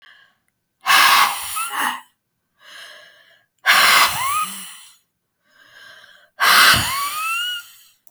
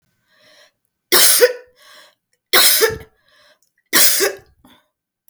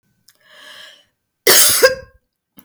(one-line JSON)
{"exhalation_length": "8.1 s", "exhalation_amplitude": 32766, "exhalation_signal_mean_std_ratio": 0.49, "three_cough_length": "5.3 s", "three_cough_amplitude": 32768, "three_cough_signal_mean_std_ratio": 0.39, "cough_length": "2.6 s", "cough_amplitude": 32768, "cough_signal_mean_std_ratio": 0.36, "survey_phase": "beta (2021-08-13 to 2022-03-07)", "age": "45-64", "gender": "Female", "wearing_mask": "No", "symptom_none": true, "smoker_status": "Ex-smoker", "respiratory_condition_asthma": false, "respiratory_condition_other": false, "recruitment_source": "REACT", "submission_delay": "2 days", "covid_test_result": "Negative", "covid_test_method": "RT-qPCR", "influenza_a_test_result": "Negative", "influenza_b_test_result": "Negative"}